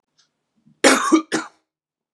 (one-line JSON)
{"cough_length": "2.1 s", "cough_amplitude": 32767, "cough_signal_mean_std_ratio": 0.35, "survey_phase": "beta (2021-08-13 to 2022-03-07)", "age": "18-44", "gender": "Male", "wearing_mask": "No", "symptom_cough_any": true, "symptom_runny_or_blocked_nose": true, "symptom_sore_throat": true, "symptom_diarrhoea": true, "symptom_fatigue": true, "symptom_onset": "3 days", "smoker_status": "Never smoked", "respiratory_condition_asthma": false, "respiratory_condition_other": false, "recruitment_source": "Test and Trace", "submission_delay": "2 days", "covid_test_result": "Positive", "covid_test_method": "ePCR"}